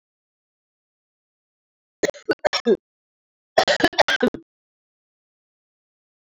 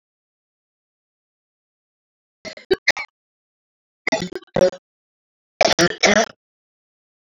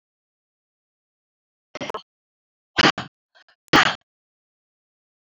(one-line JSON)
{"cough_length": "6.3 s", "cough_amplitude": 28441, "cough_signal_mean_std_ratio": 0.26, "three_cough_length": "7.3 s", "three_cough_amplitude": 28362, "three_cough_signal_mean_std_ratio": 0.26, "exhalation_length": "5.2 s", "exhalation_amplitude": 24548, "exhalation_signal_mean_std_ratio": 0.21, "survey_phase": "alpha (2021-03-01 to 2021-08-12)", "age": "45-64", "gender": "Female", "wearing_mask": "No", "symptom_cough_any": true, "symptom_fatigue": true, "symptom_headache": true, "symptom_onset": "3 days", "smoker_status": "Never smoked", "respiratory_condition_asthma": false, "respiratory_condition_other": false, "recruitment_source": "Test and Trace", "submission_delay": "2 days", "covid_test_result": "Positive", "covid_test_method": "RT-qPCR", "covid_ct_value": 18.5, "covid_ct_gene": "N gene", "covid_ct_mean": 18.6, "covid_viral_load": "780000 copies/ml", "covid_viral_load_category": "Low viral load (10K-1M copies/ml)"}